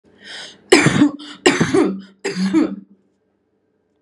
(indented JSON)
{
  "three_cough_length": "4.0 s",
  "three_cough_amplitude": 32768,
  "three_cough_signal_mean_std_ratio": 0.48,
  "survey_phase": "beta (2021-08-13 to 2022-03-07)",
  "age": "18-44",
  "gender": "Female",
  "wearing_mask": "No",
  "symptom_none": true,
  "smoker_status": "Never smoked",
  "respiratory_condition_asthma": false,
  "respiratory_condition_other": false,
  "recruitment_source": "REACT",
  "submission_delay": "0 days",
  "covid_test_result": "Negative",
  "covid_test_method": "RT-qPCR",
  "influenza_a_test_result": "Negative",
  "influenza_b_test_result": "Negative"
}